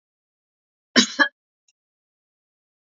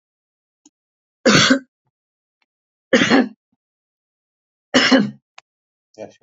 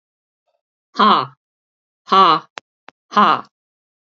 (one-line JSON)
{"cough_length": "2.9 s", "cough_amplitude": 32768, "cough_signal_mean_std_ratio": 0.19, "three_cough_length": "6.2 s", "three_cough_amplitude": 32767, "three_cough_signal_mean_std_ratio": 0.32, "exhalation_length": "4.1 s", "exhalation_amplitude": 31623, "exhalation_signal_mean_std_ratio": 0.35, "survey_phase": "beta (2021-08-13 to 2022-03-07)", "age": "65+", "gender": "Female", "wearing_mask": "No", "symptom_none": true, "smoker_status": "Ex-smoker", "respiratory_condition_asthma": false, "respiratory_condition_other": false, "recruitment_source": "REACT", "submission_delay": "2 days", "covid_test_result": "Negative", "covid_test_method": "RT-qPCR", "influenza_a_test_result": "Negative", "influenza_b_test_result": "Negative"}